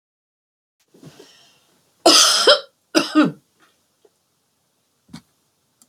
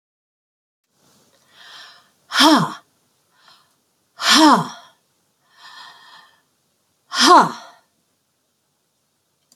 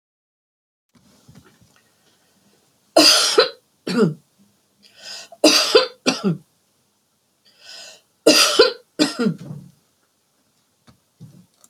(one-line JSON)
{"cough_length": "5.9 s", "cough_amplitude": 32768, "cough_signal_mean_std_ratio": 0.29, "exhalation_length": "9.6 s", "exhalation_amplitude": 32768, "exhalation_signal_mean_std_ratio": 0.28, "three_cough_length": "11.7 s", "three_cough_amplitude": 32352, "three_cough_signal_mean_std_ratio": 0.34, "survey_phase": "beta (2021-08-13 to 2022-03-07)", "age": "65+", "gender": "Female", "wearing_mask": "No", "symptom_none": true, "smoker_status": "Never smoked", "respiratory_condition_asthma": true, "respiratory_condition_other": false, "recruitment_source": "REACT", "submission_delay": "1 day", "covid_test_result": "Negative", "covid_test_method": "RT-qPCR"}